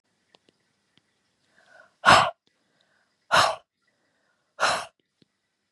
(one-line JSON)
{"exhalation_length": "5.7 s", "exhalation_amplitude": 27428, "exhalation_signal_mean_std_ratio": 0.25, "survey_phase": "beta (2021-08-13 to 2022-03-07)", "age": "18-44", "gender": "Female", "wearing_mask": "No", "symptom_none": true, "smoker_status": "Never smoked", "respiratory_condition_asthma": false, "respiratory_condition_other": false, "recruitment_source": "REACT", "submission_delay": "1 day", "covid_test_result": "Negative", "covid_test_method": "RT-qPCR", "influenza_a_test_result": "Negative", "influenza_b_test_result": "Negative"}